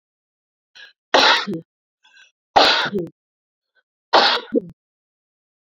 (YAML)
three_cough_length: 5.6 s
three_cough_amplitude: 30421
three_cough_signal_mean_std_ratio: 0.36
survey_phase: beta (2021-08-13 to 2022-03-07)
age: 18-44
gender: Female
wearing_mask: 'No'
symptom_shortness_of_breath: true
symptom_abdominal_pain: true
symptom_diarrhoea: true
symptom_fatigue: true
symptom_headache: true
symptom_other: true
symptom_onset: 5 days
smoker_status: Ex-smoker
respiratory_condition_asthma: true
respiratory_condition_other: false
recruitment_source: REACT
submission_delay: 1 day
covid_test_result: Negative
covid_test_method: RT-qPCR